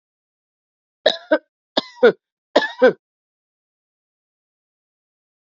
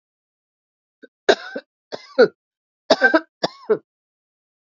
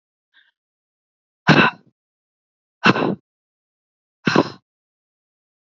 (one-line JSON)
{"three_cough_length": "5.5 s", "three_cough_amplitude": 30883, "three_cough_signal_mean_std_ratio": 0.23, "cough_length": "4.6 s", "cough_amplitude": 27287, "cough_signal_mean_std_ratio": 0.26, "exhalation_length": "5.7 s", "exhalation_amplitude": 32768, "exhalation_signal_mean_std_ratio": 0.25, "survey_phase": "beta (2021-08-13 to 2022-03-07)", "age": "45-64", "gender": "Female", "wearing_mask": "No", "symptom_cough_any": true, "symptom_runny_or_blocked_nose": true, "symptom_sore_throat": true, "symptom_headache": true, "symptom_onset": "3 days", "smoker_status": "Ex-smoker", "respiratory_condition_asthma": false, "respiratory_condition_other": false, "recruitment_source": "Test and Trace", "submission_delay": "0 days", "covid_test_result": "Positive", "covid_test_method": "RT-qPCR"}